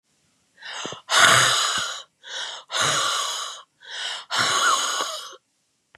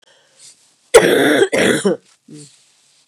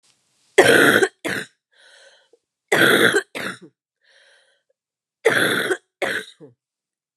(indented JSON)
{
  "exhalation_length": "6.0 s",
  "exhalation_amplitude": 30326,
  "exhalation_signal_mean_std_ratio": 0.59,
  "cough_length": "3.1 s",
  "cough_amplitude": 32768,
  "cough_signal_mean_std_ratio": 0.45,
  "three_cough_length": "7.2 s",
  "three_cough_amplitude": 32758,
  "three_cough_signal_mean_std_ratio": 0.4,
  "survey_phase": "beta (2021-08-13 to 2022-03-07)",
  "age": "45-64",
  "gender": "Female",
  "wearing_mask": "No",
  "symptom_cough_any": true,
  "symptom_new_continuous_cough": true,
  "symptom_runny_or_blocked_nose": true,
  "symptom_fatigue": true,
  "symptom_headache": true,
  "symptom_change_to_sense_of_smell_or_taste": true,
  "symptom_loss_of_taste": true,
  "symptom_onset": "3 days",
  "smoker_status": "Ex-smoker",
  "respiratory_condition_asthma": true,
  "respiratory_condition_other": false,
  "recruitment_source": "Test and Trace",
  "submission_delay": "2 days",
  "covid_test_result": "Positive",
  "covid_test_method": "ePCR"
}